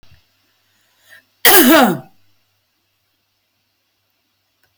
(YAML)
cough_length: 4.8 s
cough_amplitude: 32768
cough_signal_mean_std_ratio: 0.28
survey_phase: alpha (2021-03-01 to 2021-08-12)
age: 65+
gender: Female
wearing_mask: 'No'
symptom_none: true
smoker_status: Ex-smoker
respiratory_condition_asthma: true
respiratory_condition_other: false
recruitment_source: REACT
submission_delay: 1 day
covid_test_result: Negative
covid_test_method: RT-qPCR